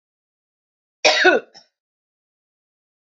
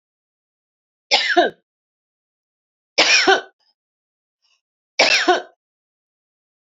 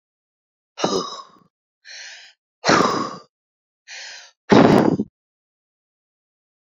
{"cough_length": "3.2 s", "cough_amplitude": 27812, "cough_signal_mean_std_ratio": 0.26, "three_cough_length": "6.7 s", "three_cough_amplitude": 32767, "three_cough_signal_mean_std_ratio": 0.33, "exhalation_length": "6.7 s", "exhalation_amplitude": 29168, "exhalation_signal_mean_std_ratio": 0.33, "survey_phase": "beta (2021-08-13 to 2022-03-07)", "age": "65+", "gender": "Female", "wearing_mask": "No", "symptom_headache": true, "smoker_status": "Ex-smoker", "respiratory_condition_asthma": false, "respiratory_condition_other": false, "recruitment_source": "REACT", "submission_delay": "2 days", "covid_test_result": "Negative", "covid_test_method": "RT-qPCR"}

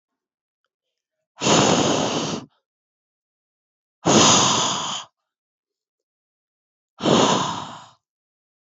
{"exhalation_length": "8.6 s", "exhalation_amplitude": 26877, "exhalation_signal_mean_std_ratio": 0.43, "survey_phase": "beta (2021-08-13 to 2022-03-07)", "age": "18-44", "gender": "Female", "wearing_mask": "No", "symptom_cough_any": true, "symptom_new_continuous_cough": true, "symptom_runny_or_blocked_nose": true, "symptom_sore_throat": true, "symptom_fatigue": true, "symptom_headache": true, "symptom_change_to_sense_of_smell_or_taste": true, "symptom_loss_of_taste": true, "symptom_onset": "4 days", "smoker_status": "Never smoked", "respiratory_condition_asthma": false, "respiratory_condition_other": false, "recruitment_source": "Test and Trace", "submission_delay": "1 day", "covid_test_result": "Positive", "covid_test_method": "RT-qPCR", "covid_ct_value": 17.7, "covid_ct_gene": "N gene"}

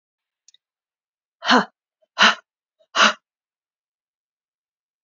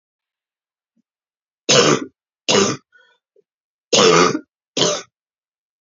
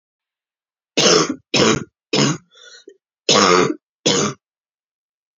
{"exhalation_length": "5.0 s", "exhalation_amplitude": 28882, "exhalation_signal_mean_std_ratio": 0.24, "three_cough_length": "5.8 s", "three_cough_amplitude": 32380, "three_cough_signal_mean_std_ratio": 0.37, "cough_length": "5.4 s", "cough_amplitude": 32767, "cough_signal_mean_std_ratio": 0.44, "survey_phase": "beta (2021-08-13 to 2022-03-07)", "age": "18-44", "gender": "Female", "wearing_mask": "No", "symptom_cough_any": true, "symptom_runny_or_blocked_nose": true, "symptom_sore_throat": true, "symptom_abdominal_pain": true, "symptom_fatigue": true, "symptom_loss_of_taste": true, "symptom_onset": "5 days", "smoker_status": "Never smoked", "respiratory_condition_asthma": false, "respiratory_condition_other": false, "recruitment_source": "Test and Trace", "submission_delay": "2 days", "covid_test_result": "Positive", "covid_test_method": "RT-qPCR", "covid_ct_value": 24.6, "covid_ct_gene": "N gene"}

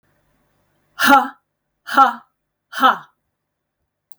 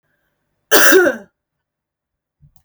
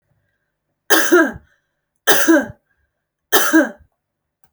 {"exhalation_length": "4.2 s", "exhalation_amplitude": 32496, "exhalation_signal_mean_std_ratio": 0.3, "cough_length": "2.6 s", "cough_amplitude": 32768, "cough_signal_mean_std_ratio": 0.33, "three_cough_length": "4.5 s", "three_cough_amplitude": 32768, "three_cough_signal_mean_std_ratio": 0.4, "survey_phase": "alpha (2021-03-01 to 2021-08-12)", "age": "18-44", "gender": "Female", "wearing_mask": "No", "symptom_shortness_of_breath": true, "symptom_onset": "12 days", "smoker_status": "Ex-smoker", "respiratory_condition_asthma": true, "respiratory_condition_other": false, "recruitment_source": "REACT", "submission_delay": "1 day", "covid_test_result": "Negative", "covid_test_method": "RT-qPCR"}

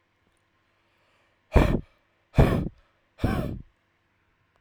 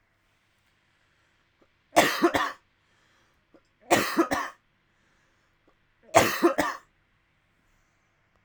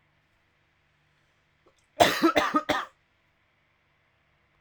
{"exhalation_length": "4.6 s", "exhalation_amplitude": 19932, "exhalation_signal_mean_std_ratio": 0.31, "three_cough_length": "8.4 s", "three_cough_amplitude": 24579, "three_cough_signal_mean_std_ratio": 0.31, "cough_length": "4.6 s", "cough_amplitude": 24613, "cough_signal_mean_std_ratio": 0.28, "survey_phase": "alpha (2021-03-01 to 2021-08-12)", "age": "18-44", "gender": "Male", "wearing_mask": "No", "symptom_cough_any": true, "smoker_status": "Never smoked", "respiratory_condition_asthma": true, "respiratory_condition_other": false, "recruitment_source": "Test and Trace", "submission_delay": "2 days", "covid_test_result": "Positive", "covid_test_method": "RT-qPCR", "covid_ct_value": 19.4, "covid_ct_gene": "ORF1ab gene", "covid_ct_mean": 19.9, "covid_viral_load": "290000 copies/ml", "covid_viral_load_category": "Low viral load (10K-1M copies/ml)"}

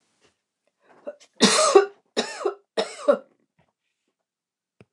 {"three_cough_length": "4.9 s", "three_cough_amplitude": 28831, "three_cough_signal_mean_std_ratio": 0.31, "survey_phase": "beta (2021-08-13 to 2022-03-07)", "age": "65+", "gender": "Female", "wearing_mask": "No", "symptom_none": true, "smoker_status": "Never smoked", "respiratory_condition_asthma": false, "respiratory_condition_other": false, "recruitment_source": "REACT", "submission_delay": "1 day", "covid_test_result": "Negative", "covid_test_method": "RT-qPCR", "influenza_a_test_result": "Negative", "influenza_b_test_result": "Negative"}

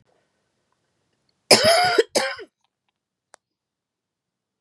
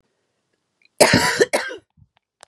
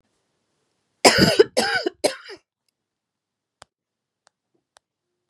{"cough_length": "4.6 s", "cough_amplitude": 32767, "cough_signal_mean_std_ratio": 0.29, "exhalation_length": "2.5 s", "exhalation_amplitude": 32768, "exhalation_signal_mean_std_ratio": 0.36, "three_cough_length": "5.3 s", "three_cough_amplitude": 32768, "three_cough_signal_mean_std_ratio": 0.26, "survey_phase": "beta (2021-08-13 to 2022-03-07)", "age": "45-64", "gender": "Female", "wearing_mask": "No", "symptom_new_continuous_cough": true, "symptom_runny_or_blocked_nose": true, "symptom_sore_throat": true, "symptom_diarrhoea": true, "symptom_headache": true, "symptom_onset": "4 days", "smoker_status": "Ex-smoker", "respiratory_condition_asthma": false, "respiratory_condition_other": false, "recruitment_source": "Test and Trace", "submission_delay": "1 day", "covid_test_result": "Positive", "covid_test_method": "RT-qPCR", "covid_ct_value": 18.5, "covid_ct_gene": "N gene"}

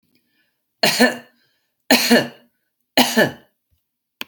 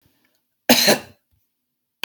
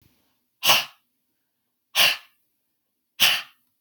{"three_cough_length": "4.3 s", "three_cough_amplitude": 32767, "three_cough_signal_mean_std_ratio": 0.36, "cough_length": "2.0 s", "cough_amplitude": 32768, "cough_signal_mean_std_ratio": 0.29, "exhalation_length": "3.8 s", "exhalation_amplitude": 26197, "exhalation_signal_mean_std_ratio": 0.31, "survey_phase": "beta (2021-08-13 to 2022-03-07)", "age": "45-64", "gender": "Female", "wearing_mask": "No", "symptom_none": true, "smoker_status": "Current smoker (1 to 10 cigarettes per day)", "respiratory_condition_asthma": false, "respiratory_condition_other": false, "recruitment_source": "REACT", "submission_delay": "1 day", "covid_test_result": "Negative", "covid_test_method": "RT-qPCR"}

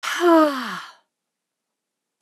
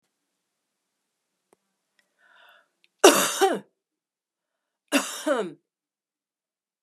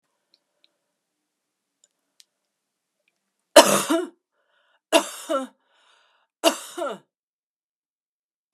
{"exhalation_length": "2.2 s", "exhalation_amplitude": 20845, "exhalation_signal_mean_std_ratio": 0.41, "cough_length": "6.8 s", "cough_amplitude": 32722, "cough_signal_mean_std_ratio": 0.24, "three_cough_length": "8.5 s", "three_cough_amplitude": 32768, "three_cough_signal_mean_std_ratio": 0.21, "survey_phase": "beta (2021-08-13 to 2022-03-07)", "age": "65+", "gender": "Female", "wearing_mask": "No", "symptom_sore_throat": true, "smoker_status": "Ex-smoker", "respiratory_condition_asthma": false, "respiratory_condition_other": false, "recruitment_source": "REACT", "submission_delay": "1 day", "covid_test_result": "Negative", "covid_test_method": "RT-qPCR"}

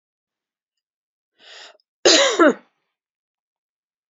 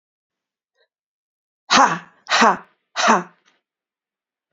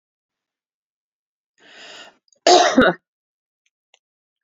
{"three_cough_length": "4.1 s", "three_cough_amplitude": 29542, "three_cough_signal_mean_std_ratio": 0.27, "exhalation_length": "4.5 s", "exhalation_amplitude": 28711, "exhalation_signal_mean_std_ratio": 0.32, "cough_length": "4.4 s", "cough_amplitude": 31107, "cough_signal_mean_std_ratio": 0.25, "survey_phase": "beta (2021-08-13 to 2022-03-07)", "age": "45-64", "gender": "Female", "wearing_mask": "No", "symptom_none": true, "smoker_status": "Never smoked", "respiratory_condition_asthma": true, "respiratory_condition_other": false, "recruitment_source": "REACT", "submission_delay": "0 days", "covid_test_result": "Negative", "covid_test_method": "RT-qPCR"}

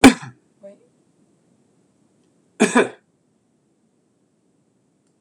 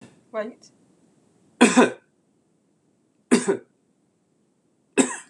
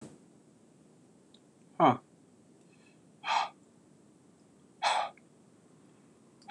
{"cough_length": "5.2 s", "cough_amplitude": 26028, "cough_signal_mean_std_ratio": 0.19, "three_cough_length": "5.3 s", "three_cough_amplitude": 26028, "three_cough_signal_mean_std_ratio": 0.27, "exhalation_length": "6.5 s", "exhalation_amplitude": 9130, "exhalation_signal_mean_std_ratio": 0.28, "survey_phase": "beta (2021-08-13 to 2022-03-07)", "age": "65+", "gender": "Male", "wearing_mask": "No", "symptom_none": true, "smoker_status": "Never smoked", "respiratory_condition_asthma": false, "respiratory_condition_other": false, "recruitment_source": "REACT", "submission_delay": "2 days", "covid_test_result": "Negative", "covid_test_method": "RT-qPCR"}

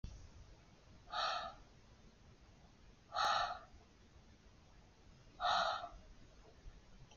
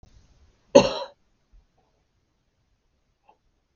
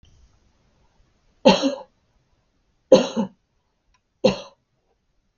{"exhalation_length": "7.2 s", "exhalation_amplitude": 2391, "exhalation_signal_mean_std_ratio": 0.45, "cough_length": "3.8 s", "cough_amplitude": 32768, "cough_signal_mean_std_ratio": 0.16, "three_cough_length": "5.4 s", "three_cough_amplitude": 32768, "three_cough_signal_mean_std_ratio": 0.24, "survey_phase": "beta (2021-08-13 to 2022-03-07)", "age": "45-64", "gender": "Female", "wearing_mask": "No", "symptom_none": true, "smoker_status": "Never smoked", "respiratory_condition_asthma": false, "respiratory_condition_other": false, "recruitment_source": "Test and Trace", "submission_delay": "1 day", "covid_test_result": "Negative", "covid_test_method": "LFT"}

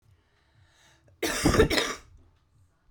{"cough_length": "2.9 s", "cough_amplitude": 15596, "cough_signal_mean_std_ratio": 0.37, "survey_phase": "alpha (2021-03-01 to 2021-08-12)", "age": "45-64", "gender": "Female", "wearing_mask": "No", "symptom_cough_any": true, "symptom_abdominal_pain": true, "symptom_diarrhoea": true, "symptom_fatigue": true, "symptom_headache": true, "symptom_change_to_sense_of_smell_or_taste": true, "symptom_loss_of_taste": true, "smoker_status": "Current smoker (11 or more cigarettes per day)", "respiratory_condition_asthma": false, "respiratory_condition_other": false, "recruitment_source": "Test and Trace", "submission_delay": "1 day", "covid_test_result": "Positive", "covid_test_method": "RT-qPCR", "covid_ct_value": 16.5, "covid_ct_gene": "ORF1ab gene", "covid_ct_mean": 18.4, "covid_viral_load": "920000 copies/ml", "covid_viral_load_category": "Low viral load (10K-1M copies/ml)"}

